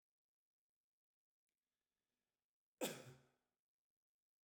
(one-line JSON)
{"cough_length": "4.4 s", "cough_amplitude": 986, "cough_signal_mean_std_ratio": 0.17, "survey_phase": "beta (2021-08-13 to 2022-03-07)", "age": "65+", "gender": "Male", "wearing_mask": "No", "symptom_none": true, "smoker_status": "Ex-smoker", "respiratory_condition_asthma": false, "respiratory_condition_other": false, "recruitment_source": "REACT", "submission_delay": "2 days", "covid_test_result": "Negative", "covid_test_method": "RT-qPCR"}